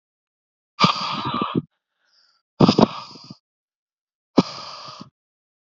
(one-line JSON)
{"exhalation_length": "5.7 s", "exhalation_amplitude": 29882, "exhalation_signal_mean_std_ratio": 0.3, "survey_phase": "beta (2021-08-13 to 2022-03-07)", "age": "18-44", "gender": "Male", "wearing_mask": "No", "symptom_cough_any": true, "smoker_status": "Never smoked", "respiratory_condition_asthma": false, "respiratory_condition_other": false, "recruitment_source": "Test and Trace", "submission_delay": "1 day", "covid_test_result": "Positive", "covid_test_method": "ePCR"}